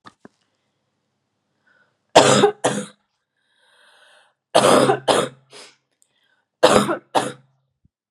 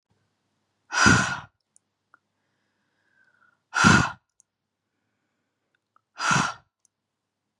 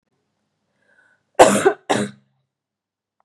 {"three_cough_length": "8.1 s", "three_cough_amplitude": 32768, "three_cough_signal_mean_std_ratio": 0.34, "exhalation_length": "7.6 s", "exhalation_amplitude": 25701, "exhalation_signal_mean_std_ratio": 0.28, "cough_length": "3.2 s", "cough_amplitude": 32768, "cough_signal_mean_std_ratio": 0.27, "survey_phase": "beta (2021-08-13 to 2022-03-07)", "age": "45-64", "gender": "Female", "wearing_mask": "No", "symptom_cough_any": true, "symptom_runny_or_blocked_nose": true, "symptom_onset": "12 days", "smoker_status": "Never smoked", "respiratory_condition_asthma": false, "respiratory_condition_other": false, "recruitment_source": "REACT", "submission_delay": "1 day", "covid_test_result": "Negative", "covid_test_method": "RT-qPCR", "influenza_a_test_result": "Unknown/Void", "influenza_b_test_result": "Unknown/Void"}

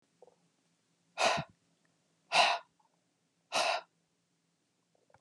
{"exhalation_length": "5.2 s", "exhalation_amplitude": 8117, "exhalation_signal_mean_std_ratio": 0.3, "survey_phase": "beta (2021-08-13 to 2022-03-07)", "age": "65+", "gender": "Male", "wearing_mask": "No", "symptom_none": true, "smoker_status": "Never smoked", "respiratory_condition_asthma": false, "respiratory_condition_other": false, "recruitment_source": "REACT", "submission_delay": "1 day", "covid_test_result": "Negative", "covid_test_method": "RT-qPCR", "influenza_a_test_result": "Negative", "influenza_b_test_result": "Negative"}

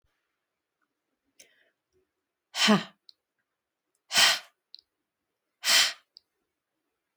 {"exhalation_length": "7.2 s", "exhalation_amplitude": 14690, "exhalation_signal_mean_std_ratio": 0.26, "survey_phase": "beta (2021-08-13 to 2022-03-07)", "age": "65+", "gender": "Female", "wearing_mask": "No", "symptom_none": true, "smoker_status": "Never smoked", "respiratory_condition_asthma": false, "respiratory_condition_other": false, "recruitment_source": "REACT", "submission_delay": "2 days", "covid_test_result": "Negative", "covid_test_method": "RT-qPCR", "influenza_a_test_result": "Unknown/Void", "influenza_b_test_result": "Unknown/Void"}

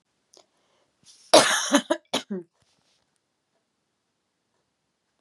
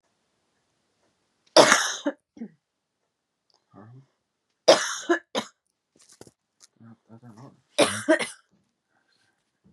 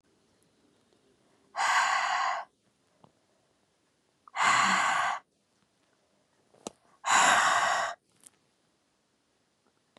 {"cough_length": "5.2 s", "cough_amplitude": 28944, "cough_signal_mean_std_ratio": 0.24, "three_cough_length": "9.7 s", "three_cough_amplitude": 32767, "three_cough_signal_mean_std_ratio": 0.25, "exhalation_length": "10.0 s", "exhalation_amplitude": 9737, "exhalation_signal_mean_std_ratio": 0.42, "survey_phase": "beta (2021-08-13 to 2022-03-07)", "age": "18-44", "gender": "Female", "wearing_mask": "No", "symptom_cough_any": true, "symptom_sore_throat": true, "symptom_onset": "13 days", "smoker_status": "Never smoked", "respiratory_condition_asthma": false, "respiratory_condition_other": false, "recruitment_source": "REACT", "submission_delay": "4 days", "covid_test_result": "Negative", "covid_test_method": "RT-qPCR", "influenza_a_test_result": "Negative", "influenza_b_test_result": "Negative"}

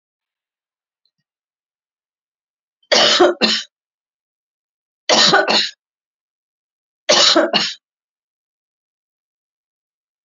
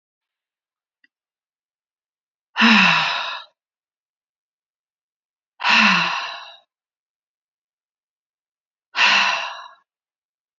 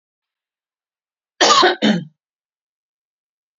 {"three_cough_length": "10.2 s", "three_cough_amplitude": 32767, "three_cough_signal_mean_std_ratio": 0.33, "exhalation_length": "10.6 s", "exhalation_amplitude": 26588, "exhalation_signal_mean_std_ratio": 0.33, "cough_length": "3.6 s", "cough_amplitude": 30094, "cough_signal_mean_std_ratio": 0.31, "survey_phase": "beta (2021-08-13 to 2022-03-07)", "age": "65+", "gender": "Female", "wearing_mask": "No", "symptom_none": true, "smoker_status": "Never smoked", "respiratory_condition_asthma": false, "respiratory_condition_other": false, "recruitment_source": "REACT", "submission_delay": "2 days", "covid_test_result": "Negative", "covid_test_method": "RT-qPCR"}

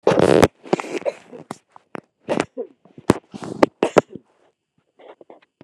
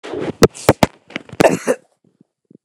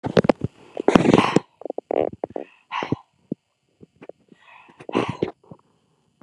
{"three_cough_length": "5.6 s", "three_cough_amplitude": 29204, "three_cough_signal_mean_std_ratio": 0.29, "cough_length": "2.6 s", "cough_amplitude": 29204, "cough_signal_mean_std_ratio": 0.33, "exhalation_length": "6.2 s", "exhalation_amplitude": 29204, "exhalation_signal_mean_std_ratio": 0.3, "survey_phase": "beta (2021-08-13 to 2022-03-07)", "age": "65+", "gender": "Female", "wearing_mask": "No", "symptom_runny_or_blocked_nose": true, "symptom_sore_throat": true, "smoker_status": "Never smoked", "respiratory_condition_asthma": false, "respiratory_condition_other": false, "recruitment_source": "REACT", "submission_delay": "1 day", "covid_test_result": "Negative", "covid_test_method": "RT-qPCR", "influenza_a_test_result": "Negative", "influenza_b_test_result": "Negative"}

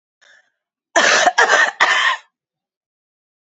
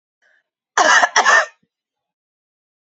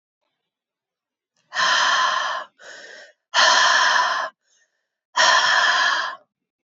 {"three_cough_length": "3.4 s", "three_cough_amplitude": 29301, "three_cough_signal_mean_std_ratio": 0.46, "cough_length": "2.8 s", "cough_amplitude": 31169, "cough_signal_mean_std_ratio": 0.37, "exhalation_length": "6.7 s", "exhalation_amplitude": 24061, "exhalation_signal_mean_std_ratio": 0.56, "survey_phase": "beta (2021-08-13 to 2022-03-07)", "age": "18-44", "gender": "Female", "wearing_mask": "No", "symptom_cough_any": true, "symptom_runny_or_blocked_nose": true, "symptom_shortness_of_breath": true, "symptom_fatigue": true, "symptom_headache": true, "symptom_onset": "3 days", "smoker_status": "Never smoked", "respiratory_condition_asthma": false, "respiratory_condition_other": false, "recruitment_source": "Test and Trace", "submission_delay": "2 days", "covid_test_result": "Positive", "covid_test_method": "RT-qPCR", "covid_ct_value": 29.2, "covid_ct_gene": "N gene"}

